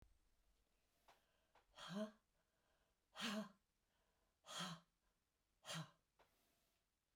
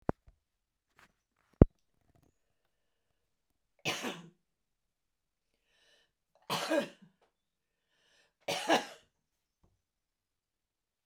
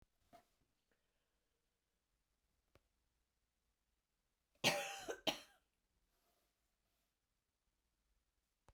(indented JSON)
{
  "exhalation_length": "7.2 s",
  "exhalation_amplitude": 586,
  "exhalation_signal_mean_std_ratio": 0.35,
  "three_cough_length": "11.1 s",
  "three_cough_amplitude": 23198,
  "three_cough_signal_mean_std_ratio": 0.17,
  "cough_length": "8.7 s",
  "cough_amplitude": 2644,
  "cough_signal_mean_std_ratio": 0.18,
  "survey_phase": "beta (2021-08-13 to 2022-03-07)",
  "age": "65+",
  "gender": "Female",
  "wearing_mask": "No",
  "symptom_cough_any": true,
  "smoker_status": "Never smoked",
  "respiratory_condition_asthma": false,
  "respiratory_condition_other": false,
  "recruitment_source": "REACT",
  "submission_delay": "0 days",
  "covid_test_result": "Negative",
  "covid_test_method": "RT-qPCR"
}